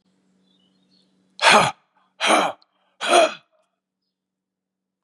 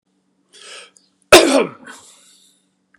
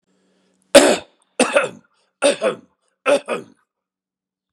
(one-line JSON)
{"exhalation_length": "5.0 s", "exhalation_amplitude": 30626, "exhalation_signal_mean_std_ratio": 0.32, "cough_length": "3.0 s", "cough_amplitude": 32768, "cough_signal_mean_std_ratio": 0.26, "three_cough_length": "4.5 s", "three_cough_amplitude": 32768, "three_cough_signal_mean_std_ratio": 0.33, "survey_phase": "beta (2021-08-13 to 2022-03-07)", "age": "45-64", "gender": "Male", "wearing_mask": "No", "symptom_runny_or_blocked_nose": true, "smoker_status": "Never smoked", "respiratory_condition_asthma": false, "respiratory_condition_other": false, "recruitment_source": "REACT", "submission_delay": "1 day", "covid_test_result": "Negative", "covid_test_method": "RT-qPCR", "influenza_a_test_result": "Negative", "influenza_b_test_result": "Negative"}